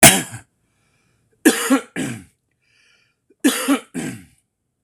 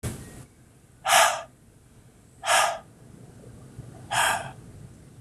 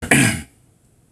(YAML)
three_cough_length: 4.8 s
three_cough_amplitude: 26028
three_cough_signal_mean_std_ratio: 0.33
exhalation_length: 5.2 s
exhalation_amplitude: 18093
exhalation_signal_mean_std_ratio: 0.42
cough_length: 1.1 s
cough_amplitude: 26028
cough_signal_mean_std_ratio: 0.43
survey_phase: beta (2021-08-13 to 2022-03-07)
age: 45-64
gender: Male
wearing_mask: 'No'
symptom_none: true
smoker_status: Ex-smoker
respiratory_condition_asthma: true
respiratory_condition_other: false
recruitment_source: REACT
submission_delay: 2 days
covid_test_result: Negative
covid_test_method: RT-qPCR
influenza_a_test_result: Negative
influenza_b_test_result: Negative